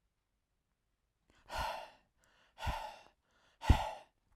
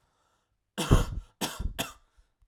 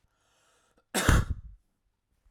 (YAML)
exhalation_length: 4.4 s
exhalation_amplitude: 8308
exhalation_signal_mean_std_ratio: 0.26
three_cough_length: 2.5 s
three_cough_amplitude: 19883
three_cough_signal_mean_std_ratio: 0.35
cough_length: 2.3 s
cough_amplitude: 14463
cough_signal_mean_std_ratio: 0.31
survey_phase: alpha (2021-03-01 to 2021-08-12)
age: 18-44
gender: Male
wearing_mask: 'No'
symptom_none: true
smoker_status: Never smoked
respiratory_condition_asthma: false
respiratory_condition_other: false
recruitment_source: REACT
submission_delay: 0 days
covid_test_result: Negative
covid_test_method: RT-qPCR